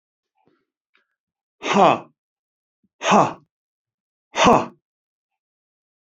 {"exhalation_length": "6.1 s", "exhalation_amplitude": 27031, "exhalation_signal_mean_std_ratio": 0.28, "survey_phase": "beta (2021-08-13 to 2022-03-07)", "age": "65+", "gender": "Male", "wearing_mask": "No", "symptom_none": true, "smoker_status": "Ex-smoker", "respiratory_condition_asthma": false, "respiratory_condition_other": false, "recruitment_source": "REACT", "submission_delay": "0 days", "covid_test_result": "Negative", "covid_test_method": "RT-qPCR", "influenza_a_test_result": "Negative", "influenza_b_test_result": "Negative"}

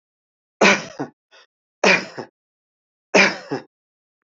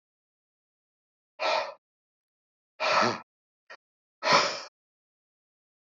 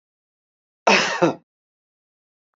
{"three_cough_length": "4.3 s", "three_cough_amplitude": 27151, "three_cough_signal_mean_std_ratio": 0.32, "exhalation_length": "5.8 s", "exhalation_amplitude": 13565, "exhalation_signal_mean_std_ratio": 0.32, "cough_length": "2.6 s", "cough_amplitude": 25726, "cough_signal_mean_std_ratio": 0.3, "survey_phase": "beta (2021-08-13 to 2022-03-07)", "age": "65+", "gender": "Male", "wearing_mask": "No", "symptom_none": true, "smoker_status": "Ex-smoker", "respiratory_condition_asthma": false, "respiratory_condition_other": false, "recruitment_source": "REACT", "submission_delay": "1 day", "covid_test_result": "Negative", "covid_test_method": "RT-qPCR"}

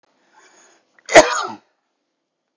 {"three_cough_length": "2.6 s", "three_cough_amplitude": 32768, "three_cough_signal_mean_std_ratio": 0.23, "survey_phase": "beta (2021-08-13 to 2022-03-07)", "age": "65+", "gender": "Male", "wearing_mask": "No", "symptom_none": true, "smoker_status": "Never smoked", "respiratory_condition_asthma": false, "respiratory_condition_other": false, "recruitment_source": "REACT", "submission_delay": "3 days", "covid_test_result": "Negative", "covid_test_method": "RT-qPCR"}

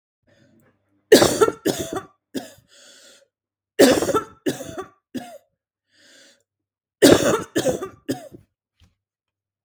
{"three_cough_length": "9.6 s", "three_cough_amplitude": 32768, "three_cough_signal_mean_std_ratio": 0.32, "survey_phase": "beta (2021-08-13 to 2022-03-07)", "age": "18-44", "gender": "Female", "wearing_mask": "No", "symptom_none": true, "smoker_status": "Current smoker (1 to 10 cigarettes per day)", "respiratory_condition_asthma": false, "respiratory_condition_other": false, "recruitment_source": "REACT", "submission_delay": "4 days", "covid_test_result": "Negative", "covid_test_method": "RT-qPCR", "influenza_a_test_result": "Negative", "influenza_b_test_result": "Negative"}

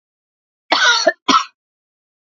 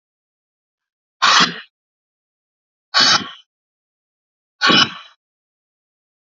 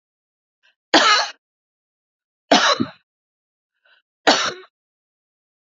{"cough_length": "2.2 s", "cough_amplitude": 27699, "cough_signal_mean_std_ratio": 0.4, "exhalation_length": "6.4 s", "exhalation_amplitude": 32767, "exhalation_signal_mean_std_ratio": 0.29, "three_cough_length": "5.6 s", "three_cough_amplitude": 32768, "three_cough_signal_mean_std_ratio": 0.3, "survey_phase": "beta (2021-08-13 to 2022-03-07)", "age": "45-64", "gender": "Female", "wearing_mask": "No", "symptom_runny_or_blocked_nose": true, "symptom_shortness_of_breath": true, "symptom_sore_throat": true, "symptom_fatigue": true, "symptom_fever_high_temperature": true, "symptom_headache": true, "symptom_change_to_sense_of_smell_or_taste": true, "smoker_status": "Ex-smoker", "respiratory_condition_asthma": false, "respiratory_condition_other": false, "recruitment_source": "Test and Trace", "submission_delay": "1 day", "covid_test_result": "Positive", "covid_test_method": "LFT"}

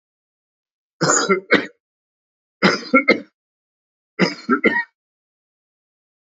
{"three_cough_length": "6.3 s", "three_cough_amplitude": 30027, "three_cough_signal_mean_std_ratio": 0.34, "survey_phase": "alpha (2021-03-01 to 2021-08-12)", "age": "45-64", "gender": "Male", "wearing_mask": "No", "symptom_cough_any": true, "symptom_abdominal_pain": true, "symptom_fatigue": true, "symptom_fever_high_temperature": true, "symptom_change_to_sense_of_smell_or_taste": true, "symptom_onset": "6 days", "smoker_status": "Ex-smoker", "respiratory_condition_asthma": false, "respiratory_condition_other": false, "recruitment_source": "Test and Trace", "submission_delay": "1 day", "covid_test_result": "Positive", "covid_test_method": "RT-qPCR", "covid_ct_value": 18.9, "covid_ct_gene": "ORF1ab gene", "covid_ct_mean": 19.7, "covid_viral_load": "330000 copies/ml", "covid_viral_load_category": "Low viral load (10K-1M copies/ml)"}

